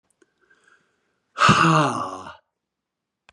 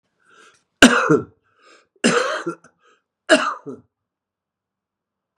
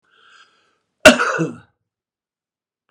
exhalation_length: 3.3 s
exhalation_amplitude: 25480
exhalation_signal_mean_std_ratio: 0.36
three_cough_length: 5.4 s
three_cough_amplitude: 32768
three_cough_signal_mean_std_ratio: 0.31
cough_length: 2.9 s
cough_amplitude: 32768
cough_signal_mean_std_ratio: 0.24
survey_phase: beta (2021-08-13 to 2022-03-07)
age: 65+
gender: Male
wearing_mask: 'No'
symptom_none: true
smoker_status: Ex-smoker
respiratory_condition_asthma: false
respiratory_condition_other: false
recruitment_source: REACT
submission_delay: 8 days
covid_test_result: Negative
covid_test_method: RT-qPCR
influenza_a_test_result: Negative
influenza_b_test_result: Negative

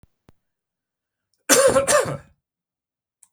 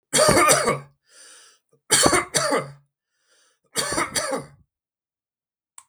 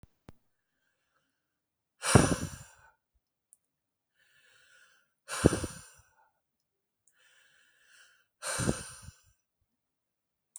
cough_length: 3.3 s
cough_amplitude: 32768
cough_signal_mean_std_ratio: 0.34
three_cough_length: 5.9 s
three_cough_amplitude: 32768
three_cough_signal_mean_std_ratio: 0.45
exhalation_length: 10.6 s
exhalation_amplitude: 21734
exhalation_signal_mean_std_ratio: 0.21
survey_phase: beta (2021-08-13 to 2022-03-07)
age: 45-64
gender: Male
wearing_mask: 'No'
symptom_none: true
smoker_status: Never smoked
respiratory_condition_asthma: false
respiratory_condition_other: false
recruitment_source: Test and Trace
submission_delay: 0 days
covid_test_result: Negative
covid_test_method: LFT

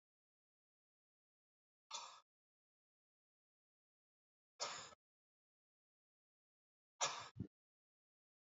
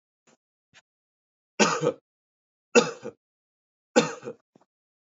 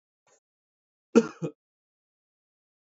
exhalation_length: 8.5 s
exhalation_amplitude: 1622
exhalation_signal_mean_std_ratio: 0.21
three_cough_length: 5.0 s
three_cough_amplitude: 20809
three_cough_signal_mean_std_ratio: 0.25
cough_length: 2.8 s
cough_amplitude: 18033
cough_signal_mean_std_ratio: 0.15
survey_phase: beta (2021-08-13 to 2022-03-07)
age: 18-44
gender: Male
wearing_mask: 'No'
symptom_runny_or_blocked_nose: true
smoker_status: Never smoked
respiratory_condition_asthma: false
respiratory_condition_other: false
recruitment_source: Test and Trace
submission_delay: 1 day
covid_test_result: Positive
covid_test_method: ePCR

